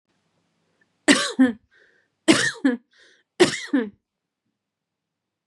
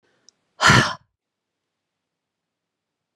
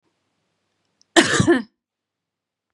{
  "three_cough_length": "5.5 s",
  "three_cough_amplitude": 30873,
  "three_cough_signal_mean_std_ratio": 0.32,
  "exhalation_length": "3.2 s",
  "exhalation_amplitude": 30390,
  "exhalation_signal_mean_std_ratio": 0.23,
  "cough_length": "2.7 s",
  "cough_amplitude": 32767,
  "cough_signal_mean_std_ratio": 0.3,
  "survey_phase": "beta (2021-08-13 to 2022-03-07)",
  "age": "45-64",
  "gender": "Female",
  "wearing_mask": "No",
  "symptom_none": true,
  "smoker_status": "Never smoked",
  "respiratory_condition_asthma": true,
  "respiratory_condition_other": false,
  "recruitment_source": "REACT",
  "submission_delay": "1 day",
  "covid_test_result": "Negative",
  "covid_test_method": "RT-qPCR"
}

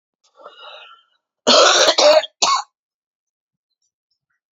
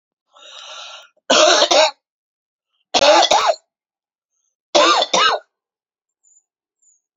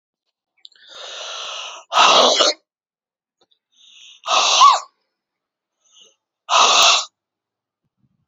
{
  "cough_length": "4.5 s",
  "cough_amplitude": 31480,
  "cough_signal_mean_std_ratio": 0.38,
  "three_cough_length": "7.2 s",
  "three_cough_amplitude": 32767,
  "three_cough_signal_mean_std_ratio": 0.42,
  "exhalation_length": "8.3 s",
  "exhalation_amplitude": 32767,
  "exhalation_signal_mean_std_ratio": 0.39,
  "survey_phase": "beta (2021-08-13 to 2022-03-07)",
  "age": "45-64",
  "gender": "Female",
  "wearing_mask": "No",
  "symptom_cough_any": true,
  "symptom_new_continuous_cough": true,
  "symptom_runny_or_blocked_nose": true,
  "symptom_sore_throat": true,
  "symptom_fatigue": true,
  "symptom_headache": true,
  "symptom_onset": "2 days",
  "smoker_status": "Never smoked",
  "respiratory_condition_asthma": false,
  "respiratory_condition_other": false,
  "recruitment_source": "Test and Trace",
  "submission_delay": "1 day",
  "covid_test_result": "Positive",
  "covid_test_method": "ePCR"
}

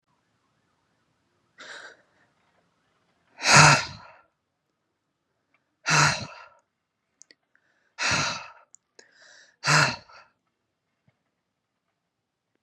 {
  "exhalation_length": "12.6 s",
  "exhalation_amplitude": 27260,
  "exhalation_signal_mean_std_ratio": 0.25,
  "survey_phase": "beta (2021-08-13 to 2022-03-07)",
  "age": "18-44",
  "gender": "Male",
  "wearing_mask": "No",
  "symptom_fever_high_temperature": true,
  "symptom_onset": "4 days",
  "smoker_status": "Never smoked",
  "respiratory_condition_asthma": false,
  "respiratory_condition_other": false,
  "recruitment_source": "Test and Trace",
  "submission_delay": "3 days",
  "covid_test_result": "Negative",
  "covid_test_method": "RT-qPCR"
}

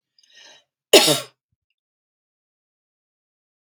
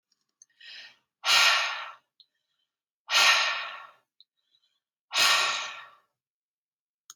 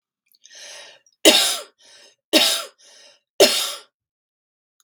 {
  "cough_length": "3.6 s",
  "cough_amplitude": 32768,
  "cough_signal_mean_std_ratio": 0.19,
  "exhalation_length": "7.2 s",
  "exhalation_amplitude": 17026,
  "exhalation_signal_mean_std_ratio": 0.39,
  "three_cough_length": "4.8 s",
  "three_cough_amplitude": 32768,
  "three_cough_signal_mean_std_ratio": 0.33,
  "survey_phase": "beta (2021-08-13 to 2022-03-07)",
  "age": "45-64",
  "gender": "Female",
  "wearing_mask": "No",
  "symptom_none": true,
  "smoker_status": "Ex-smoker",
  "respiratory_condition_asthma": false,
  "respiratory_condition_other": false,
  "recruitment_source": "REACT",
  "submission_delay": "3 days",
  "covid_test_result": "Negative",
  "covid_test_method": "RT-qPCR",
  "influenza_a_test_result": "Negative",
  "influenza_b_test_result": "Negative"
}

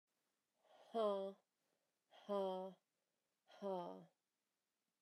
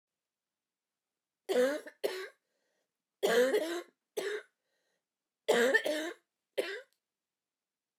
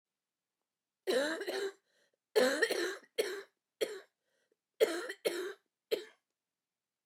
{
  "exhalation_length": "5.0 s",
  "exhalation_amplitude": 1138,
  "exhalation_signal_mean_std_ratio": 0.38,
  "three_cough_length": "8.0 s",
  "three_cough_amplitude": 6448,
  "three_cough_signal_mean_std_ratio": 0.4,
  "cough_length": "7.1 s",
  "cough_amplitude": 5554,
  "cough_signal_mean_std_ratio": 0.41,
  "survey_phase": "beta (2021-08-13 to 2022-03-07)",
  "age": "45-64",
  "gender": "Female",
  "wearing_mask": "No",
  "symptom_cough_any": true,
  "symptom_fatigue": true,
  "symptom_fever_high_temperature": true,
  "symptom_change_to_sense_of_smell_or_taste": true,
  "symptom_loss_of_taste": true,
  "symptom_onset": "5 days",
  "smoker_status": "Never smoked",
  "respiratory_condition_asthma": false,
  "respiratory_condition_other": false,
  "recruitment_source": "Test and Trace",
  "submission_delay": "2 days",
  "covid_test_result": "Positive",
  "covid_test_method": "RT-qPCR",
  "covid_ct_value": 15.1,
  "covid_ct_gene": "ORF1ab gene",
  "covid_ct_mean": 15.4,
  "covid_viral_load": "8600000 copies/ml",
  "covid_viral_load_category": "High viral load (>1M copies/ml)"
}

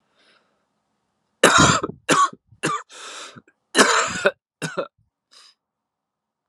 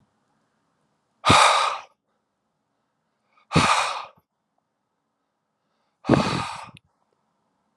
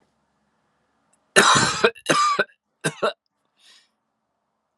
{
  "cough_length": "6.5 s",
  "cough_amplitude": 32753,
  "cough_signal_mean_std_ratio": 0.36,
  "exhalation_length": "7.8 s",
  "exhalation_amplitude": 25463,
  "exhalation_signal_mean_std_ratio": 0.32,
  "three_cough_length": "4.8 s",
  "three_cough_amplitude": 32767,
  "three_cough_signal_mean_std_ratio": 0.36,
  "survey_phase": "alpha (2021-03-01 to 2021-08-12)",
  "age": "18-44",
  "gender": "Male",
  "wearing_mask": "No",
  "symptom_cough_any": true,
  "symptom_fatigue": true,
  "symptom_headache": true,
  "symptom_change_to_sense_of_smell_or_taste": true,
  "symptom_loss_of_taste": true,
  "symptom_onset": "3 days",
  "smoker_status": "Never smoked",
  "respiratory_condition_asthma": false,
  "respiratory_condition_other": false,
  "recruitment_source": "Test and Trace",
  "submission_delay": "2 days",
  "covid_test_result": "Positive",
  "covid_test_method": "RT-qPCR",
  "covid_ct_value": 16.0,
  "covid_ct_gene": "N gene",
  "covid_ct_mean": 16.3,
  "covid_viral_load": "4300000 copies/ml",
  "covid_viral_load_category": "High viral load (>1M copies/ml)"
}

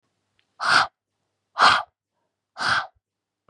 {
  "exhalation_length": "3.5 s",
  "exhalation_amplitude": 25650,
  "exhalation_signal_mean_std_ratio": 0.34,
  "survey_phase": "beta (2021-08-13 to 2022-03-07)",
  "age": "18-44",
  "gender": "Female",
  "wearing_mask": "No",
  "symptom_none": true,
  "symptom_onset": "12 days",
  "smoker_status": "Never smoked",
  "respiratory_condition_asthma": false,
  "respiratory_condition_other": false,
  "recruitment_source": "REACT",
  "submission_delay": "1 day",
  "covid_test_result": "Negative",
  "covid_test_method": "RT-qPCR",
  "influenza_a_test_result": "Negative",
  "influenza_b_test_result": "Negative"
}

